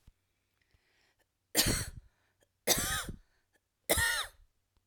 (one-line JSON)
{"three_cough_length": "4.9 s", "three_cough_amplitude": 10147, "three_cough_signal_mean_std_ratio": 0.38, "survey_phase": "alpha (2021-03-01 to 2021-08-12)", "age": "45-64", "gender": "Female", "wearing_mask": "No", "symptom_none": true, "smoker_status": "Never smoked", "respiratory_condition_asthma": false, "respiratory_condition_other": false, "recruitment_source": "REACT", "submission_delay": "4 days", "covid_test_result": "Negative", "covid_test_method": "RT-qPCR"}